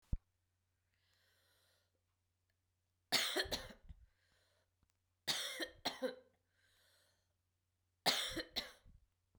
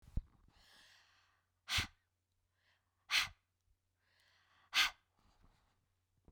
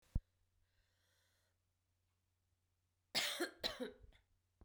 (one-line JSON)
{"three_cough_length": "9.4 s", "three_cough_amplitude": 3858, "three_cough_signal_mean_std_ratio": 0.32, "exhalation_length": "6.3 s", "exhalation_amplitude": 3634, "exhalation_signal_mean_std_ratio": 0.24, "cough_length": "4.6 s", "cough_amplitude": 2095, "cough_signal_mean_std_ratio": 0.28, "survey_phase": "beta (2021-08-13 to 2022-03-07)", "age": "45-64", "gender": "Female", "wearing_mask": "No", "symptom_runny_or_blocked_nose": true, "symptom_headache": true, "symptom_change_to_sense_of_smell_or_taste": true, "symptom_loss_of_taste": true, "smoker_status": "Never smoked", "respiratory_condition_asthma": false, "respiratory_condition_other": false, "recruitment_source": "Test and Trace", "submission_delay": "2 days", "covid_test_result": "Positive", "covid_test_method": "RT-qPCR", "covid_ct_value": 17.1, "covid_ct_gene": "ORF1ab gene", "covid_ct_mean": 17.9, "covid_viral_load": "1400000 copies/ml", "covid_viral_load_category": "High viral load (>1M copies/ml)"}